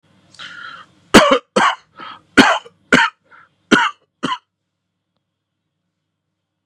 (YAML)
three_cough_length: 6.7 s
three_cough_amplitude: 32768
three_cough_signal_mean_std_ratio: 0.32
survey_phase: beta (2021-08-13 to 2022-03-07)
age: 45-64
gender: Male
wearing_mask: 'No'
symptom_none: true
smoker_status: Ex-smoker
respiratory_condition_asthma: false
respiratory_condition_other: false
recruitment_source: REACT
submission_delay: 2 days
covid_test_result: Negative
covid_test_method: RT-qPCR
influenza_a_test_result: Negative
influenza_b_test_result: Negative